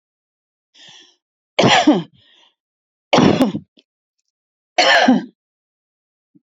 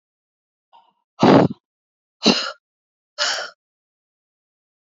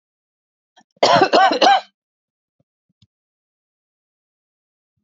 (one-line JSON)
{"three_cough_length": "6.5 s", "three_cough_amplitude": 32049, "three_cough_signal_mean_std_ratio": 0.36, "exhalation_length": "4.9 s", "exhalation_amplitude": 32767, "exhalation_signal_mean_std_ratio": 0.28, "cough_length": "5.0 s", "cough_amplitude": 29032, "cough_signal_mean_std_ratio": 0.3, "survey_phase": "beta (2021-08-13 to 2022-03-07)", "age": "45-64", "gender": "Female", "wearing_mask": "No", "symptom_fatigue": true, "smoker_status": "Ex-smoker", "respiratory_condition_asthma": false, "respiratory_condition_other": false, "recruitment_source": "REACT", "submission_delay": "2 days", "covid_test_result": "Negative", "covid_test_method": "RT-qPCR", "influenza_a_test_result": "Unknown/Void", "influenza_b_test_result": "Unknown/Void"}